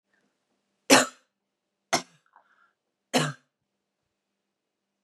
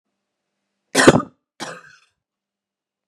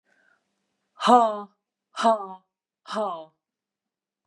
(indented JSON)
{
  "three_cough_length": "5.0 s",
  "three_cough_amplitude": 29460,
  "three_cough_signal_mean_std_ratio": 0.2,
  "cough_length": "3.1 s",
  "cough_amplitude": 32768,
  "cough_signal_mean_std_ratio": 0.22,
  "exhalation_length": "4.3 s",
  "exhalation_amplitude": 21488,
  "exhalation_signal_mean_std_ratio": 0.31,
  "survey_phase": "beta (2021-08-13 to 2022-03-07)",
  "age": "45-64",
  "gender": "Female",
  "wearing_mask": "No",
  "symptom_cough_any": true,
  "symptom_runny_or_blocked_nose": true,
  "symptom_sore_throat": true,
  "symptom_onset": "4 days",
  "smoker_status": "Never smoked",
  "respiratory_condition_asthma": true,
  "respiratory_condition_other": false,
  "recruitment_source": "Test and Trace",
  "submission_delay": "2 days",
  "covid_test_result": "Negative",
  "covid_test_method": "RT-qPCR"
}